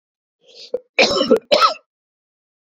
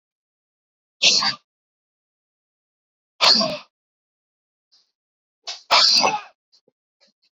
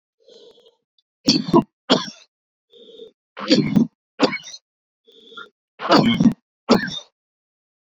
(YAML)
cough_length: 2.7 s
cough_amplitude: 30822
cough_signal_mean_std_ratio: 0.38
exhalation_length: 7.3 s
exhalation_amplitude: 26827
exhalation_signal_mean_std_ratio: 0.31
three_cough_length: 7.9 s
three_cough_amplitude: 30955
three_cough_signal_mean_std_ratio: 0.36
survey_phase: beta (2021-08-13 to 2022-03-07)
age: 18-44
gender: Male
wearing_mask: 'No'
symptom_cough_any: true
symptom_runny_or_blocked_nose: true
symptom_sore_throat: true
symptom_fatigue: true
symptom_fever_high_temperature: true
symptom_change_to_sense_of_smell_or_taste: true
symptom_onset: 3 days
smoker_status: Ex-smoker
respiratory_condition_asthma: false
respiratory_condition_other: false
recruitment_source: Test and Trace
submission_delay: 1 day
covid_test_result: Positive
covid_test_method: RT-qPCR
covid_ct_value: 16.4
covid_ct_gene: N gene
covid_ct_mean: 17.6
covid_viral_load: 1700000 copies/ml
covid_viral_load_category: High viral load (>1M copies/ml)